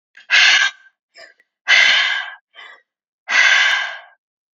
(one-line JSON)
{"exhalation_length": "4.6 s", "exhalation_amplitude": 32768, "exhalation_signal_mean_std_ratio": 0.51, "survey_phase": "beta (2021-08-13 to 2022-03-07)", "age": "18-44", "gender": "Female", "wearing_mask": "No", "symptom_none": true, "symptom_onset": "4 days", "smoker_status": "Never smoked", "respiratory_condition_asthma": false, "respiratory_condition_other": false, "recruitment_source": "REACT", "submission_delay": "1 day", "covid_test_result": "Negative", "covid_test_method": "RT-qPCR", "influenza_a_test_result": "Negative", "influenza_b_test_result": "Negative"}